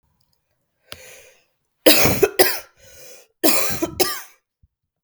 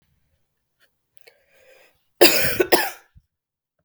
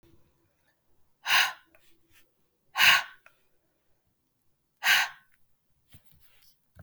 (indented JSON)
{
  "three_cough_length": "5.0 s",
  "three_cough_amplitude": 32768,
  "three_cough_signal_mean_std_ratio": 0.37,
  "cough_length": "3.8 s",
  "cough_amplitude": 32768,
  "cough_signal_mean_std_ratio": 0.28,
  "exhalation_length": "6.8 s",
  "exhalation_amplitude": 15865,
  "exhalation_signal_mean_std_ratio": 0.27,
  "survey_phase": "beta (2021-08-13 to 2022-03-07)",
  "age": "18-44",
  "gender": "Female",
  "wearing_mask": "No",
  "symptom_cough_any": true,
  "symptom_runny_or_blocked_nose": true,
  "symptom_sore_throat": true,
  "symptom_onset": "2 days",
  "smoker_status": "Ex-smoker",
  "respiratory_condition_asthma": false,
  "respiratory_condition_other": false,
  "recruitment_source": "REACT",
  "submission_delay": "2 days",
  "covid_test_result": "Positive",
  "covid_test_method": "RT-qPCR",
  "covid_ct_value": 20.0,
  "covid_ct_gene": "E gene",
  "influenza_a_test_result": "Negative",
  "influenza_b_test_result": "Negative"
}